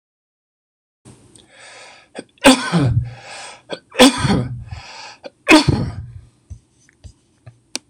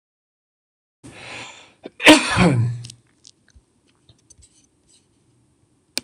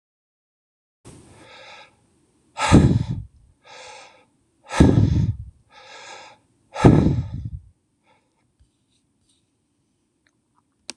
{
  "three_cough_length": "7.9 s",
  "three_cough_amplitude": 26028,
  "three_cough_signal_mean_std_ratio": 0.36,
  "cough_length": "6.0 s",
  "cough_amplitude": 26028,
  "cough_signal_mean_std_ratio": 0.27,
  "exhalation_length": "11.0 s",
  "exhalation_amplitude": 26028,
  "exhalation_signal_mean_std_ratio": 0.3,
  "survey_phase": "beta (2021-08-13 to 2022-03-07)",
  "age": "65+",
  "gender": "Male",
  "wearing_mask": "No",
  "symptom_none": true,
  "smoker_status": "Ex-smoker",
  "respiratory_condition_asthma": false,
  "respiratory_condition_other": false,
  "recruitment_source": "REACT",
  "submission_delay": "2 days",
  "covid_test_result": "Negative",
  "covid_test_method": "RT-qPCR",
  "influenza_a_test_result": "Negative",
  "influenza_b_test_result": "Negative"
}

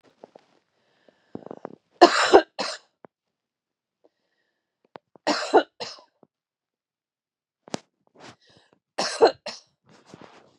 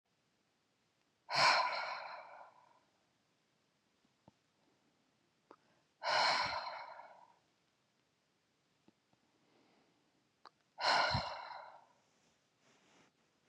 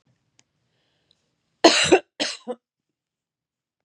{
  "three_cough_length": "10.6 s",
  "three_cough_amplitude": 32565,
  "three_cough_signal_mean_std_ratio": 0.22,
  "exhalation_length": "13.5 s",
  "exhalation_amplitude": 4651,
  "exhalation_signal_mean_std_ratio": 0.32,
  "cough_length": "3.8 s",
  "cough_amplitude": 31673,
  "cough_signal_mean_std_ratio": 0.24,
  "survey_phase": "beta (2021-08-13 to 2022-03-07)",
  "age": "45-64",
  "gender": "Female",
  "wearing_mask": "No",
  "symptom_fatigue": true,
  "smoker_status": "Never smoked",
  "respiratory_condition_asthma": false,
  "respiratory_condition_other": false,
  "recruitment_source": "REACT",
  "submission_delay": "1 day",
  "covid_test_result": "Negative",
  "covid_test_method": "RT-qPCR"
}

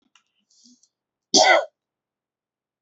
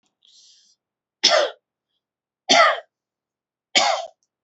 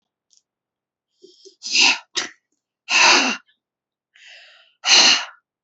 {
  "cough_length": "2.8 s",
  "cough_amplitude": 28017,
  "cough_signal_mean_std_ratio": 0.26,
  "three_cough_length": "4.4 s",
  "three_cough_amplitude": 28766,
  "three_cough_signal_mean_std_ratio": 0.33,
  "exhalation_length": "5.6 s",
  "exhalation_amplitude": 30983,
  "exhalation_signal_mean_std_ratio": 0.37,
  "survey_phase": "beta (2021-08-13 to 2022-03-07)",
  "age": "18-44",
  "gender": "Female",
  "wearing_mask": "No",
  "symptom_none": true,
  "smoker_status": "Never smoked",
  "respiratory_condition_asthma": false,
  "respiratory_condition_other": false,
  "recruitment_source": "REACT",
  "submission_delay": "2 days",
  "covid_test_result": "Negative",
  "covid_test_method": "RT-qPCR",
  "influenza_a_test_result": "Negative",
  "influenza_b_test_result": "Negative"
}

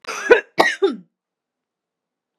{
  "cough_length": "2.4 s",
  "cough_amplitude": 32768,
  "cough_signal_mean_std_ratio": 0.33,
  "survey_phase": "beta (2021-08-13 to 2022-03-07)",
  "age": "18-44",
  "gender": "Female",
  "wearing_mask": "No",
  "symptom_none": true,
  "smoker_status": "Never smoked",
  "respiratory_condition_asthma": false,
  "respiratory_condition_other": false,
  "recruitment_source": "REACT",
  "submission_delay": "2 days",
  "covid_test_result": "Negative",
  "covid_test_method": "RT-qPCR"
}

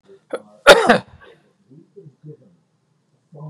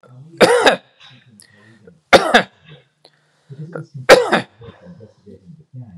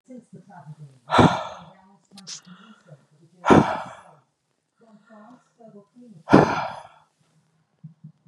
{
  "cough_length": "3.5 s",
  "cough_amplitude": 32768,
  "cough_signal_mean_std_ratio": 0.24,
  "three_cough_length": "6.0 s",
  "three_cough_amplitude": 32768,
  "three_cough_signal_mean_std_ratio": 0.32,
  "exhalation_length": "8.3 s",
  "exhalation_amplitude": 32768,
  "exhalation_signal_mean_std_ratio": 0.28,
  "survey_phase": "beta (2021-08-13 to 2022-03-07)",
  "age": "45-64",
  "gender": "Male",
  "wearing_mask": "No",
  "symptom_none": true,
  "smoker_status": "Never smoked",
  "respiratory_condition_asthma": false,
  "respiratory_condition_other": false,
  "recruitment_source": "REACT",
  "submission_delay": "1 day",
  "covid_test_result": "Negative",
  "covid_test_method": "RT-qPCR",
  "influenza_a_test_result": "Negative",
  "influenza_b_test_result": "Negative"
}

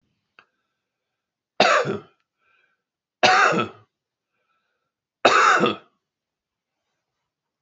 {
  "three_cough_length": "7.6 s",
  "three_cough_amplitude": 31856,
  "three_cough_signal_mean_std_ratio": 0.33,
  "survey_phase": "beta (2021-08-13 to 2022-03-07)",
  "age": "65+",
  "gender": "Male",
  "wearing_mask": "No",
  "symptom_cough_any": true,
  "symptom_shortness_of_breath": true,
  "symptom_fatigue": true,
  "symptom_onset": "13 days",
  "smoker_status": "Ex-smoker",
  "respiratory_condition_asthma": false,
  "respiratory_condition_other": false,
  "recruitment_source": "REACT",
  "submission_delay": "1 day",
  "covid_test_result": "Negative",
  "covid_test_method": "RT-qPCR"
}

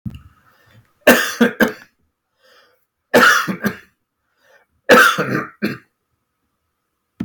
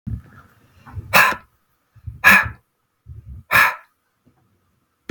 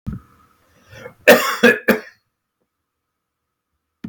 {
  "three_cough_length": "7.2 s",
  "three_cough_amplitude": 32768,
  "three_cough_signal_mean_std_ratio": 0.36,
  "exhalation_length": "5.1 s",
  "exhalation_amplitude": 32768,
  "exhalation_signal_mean_std_ratio": 0.32,
  "cough_length": "4.1 s",
  "cough_amplitude": 32768,
  "cough_signal_mean_std_ratio": 0.28,
  "survey_phase": "beta (2021-08-13 to 2022-03-07)",
  "age": "45-64",
  "gender": "Male",
  "wearing_mask": "No",
  "symptom_none": true,
  "smoker_status": "Never smoked",
  "respiratory_condition_asthma": false,
  "respiratory_condition_other": false,
  "recruitment_source": "REACT",
  "submission_delay": "1 day",
  "covid_test_result": "Negative",
  "covid_test_method": "RT-qPCR"
}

